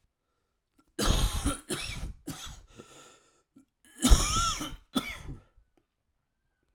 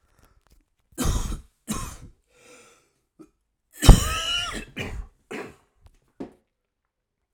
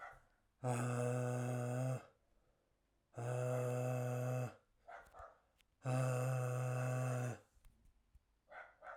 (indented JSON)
{
  "cough_length": "6.7 s",
  "cough_amplitude": 18050,
  "cough_signal_mean_std_ratio": 0.37,
  "three_cough_length": "7.3 s",
  "three_cough_amplitude": 32768,
  "three_cough_signal_mean_std_ratio": 0.24,
  "exhalation_length": "9.0 s",
  "exhalation_amplitude": 1497,
  "exhalation_signal_mean_std_ratio": 0.73,
  "survey_phase": "alpha (2021-03-01 to 2021-08-12)",
  "age": "45-64",
  "gender": "Male",
  "wearing_mask": "No",
  "symptom_cough_any": true,
  "symptom_shortness_of_breath": true,
  "symptom_fatigue": true,
  "symptom_fever_high_temperature": true,
  "symptom_headache": true,
  "smoker_status": "Current smoker (e-cigarettes or vapes only)",
  "respiratory_condition_asthma": false,
  "respiratory_condition_other": false,
  "recruitment_source": "Test and Trace",
  "submission_delay": "1 day",
  "covid_test_result": "Positive",
  "covid_test_method": "RT-qPCR",
  "covid_ct_value": 17.6,
  "covid_ct_gene": "ORF1ab gene",
  "covid_ct_mean": 18.9,
  "covid_viral_load": "660000 copies/ml",
  "covid_viral_load_category": "Low viral load (10K-1M copies/ml)"
}